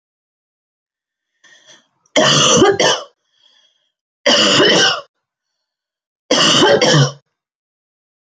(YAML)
three_cough_length: 8.4 s
three_cough_amplitude: 31109
three_cough_signal_mean_std_ratio: 0.46
survey_phase: beta (2021-08-13 to 2022-03-07)
age: 45-64
gender: Female
wearing_mask: 'No'
symptom_none: true
smoker_status: Never smoked
respiratory_condition_asthma: false
respiratory_condition_other: false
recruitment_source: REACT
submission_delay: 1 day
covid_test_result: Negative
covid_test_method: RT-qPCR
influenza_a_test_result: Negative
influenza_b_test_result: Negative